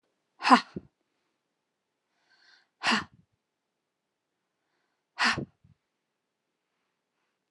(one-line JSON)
{"exhalation_length": "7.5 s", "exhalation_amplitude": 21810, "exhalation_signal_mean_std_ratio": 0.19, "survey_phase": "alpha (2021-03-01 to 2021-08-12)", "age": "65+", "gender": "Female", "wearing_mask": "No", "symptom_none": true, "smoker_status": "Never smoked", "respiratory_condition_asthma": true, "respiratory_condition_other": false, "recruitment_source": "REACT", "submission_delay": "1 day", "covid_test_result": "Negative", "covid_test_method": "RT-qPCR"}